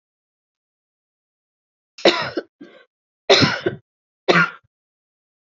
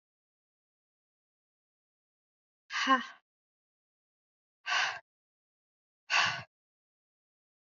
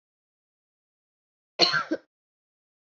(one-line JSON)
{"three_cough_length": "5.5 s", "three_cough_amplitude": 30907, "three_cough_signal_mean_std_ratio": 0.29, "exhalation_length": "7.7 s", "exhalation_amplitude": 7640, "exhalation_signal_mean_std_ratio": 0.25, "cough_length": "3.0 s", "cough_amplitude": 21693, "cough_signal_mean_std_ratio": 0.23, "survey_phase": "beta (2021-08-13 to 2022-03-07)", "age": "45-64", "gender": "Female", "wearing_mask": "No", "symptom_new_continuous_cough": true, "symptom_runny_or_blocked_nose": true, "symptom_fatigue": true, "symptom_fever_high_temperature": true, "symptom_onset": "4 days", "smoker_status": "Never smoked", "respiratory_condition_asthma": false, "respiratory_condition_other": false, "recruitment_source": "Test and Trace", "submission_delay": "1 day", "covid_test_result": "Positive", "covid_test_method": "RT-qPCR", "covid_ct_value": 33.0, "covid_ct_gene": "N gene", "covid_ct_mean": 34.2, "covid_viral_load": "5.8 copies/ml", "covid_viral_load_category": "Minimal viral load (< 10K copies/ml)"}